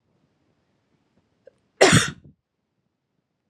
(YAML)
cough_length: 3.5 s
cough_amplitude: 30860
cough_signal_mean_std_ratio: 0.21
survey_phase: alpha (2021-03-01 to 2021-08-12)
age: 18-44
gender: Female
wearing_mask: 'No'
symptom_none: true
smoker_status: Never smoked
respiratory_condition_asthma: true
respiratory_condition_other: false
recruitment_source: REACT
submission_delay: 1 day
covid_test_result: Negative
covid_test_method: RT-qPCR